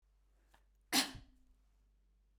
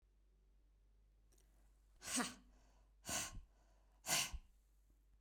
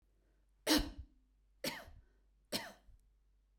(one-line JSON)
{"cough_length": "2.4 s", "cough_amplitude": 3659, "cough_signal_mean_std_ratio": 0.24, "exhalation_length": "5.2 s", "exhalation_amplitude": 1910, "exhalation_signal_mean_std_ratio": 0.38, "three_cough_length": "3.6 s", "three_cough_amplitude": 4279, "three_cough_signal_mean_std_ratio": 0.3, "survey_phase": "beta (2021-08-13 to 2022-03-07)", "age": "45-64", "gender": "Female", "wearing_mask": "No", "symptom_none": true, "smoker_status": "Ex-smoker", "respiratory_condition_asthma": false, "respiratory_condition_other": false, "recruitment_source": "REACT", "submission_delay": "1 day", "covid_test_result": "Negative", "covid_test_method": "RT-qPCR", "influenza_a_test_result": "Negative", "influenza_b_test_result": "Negative"}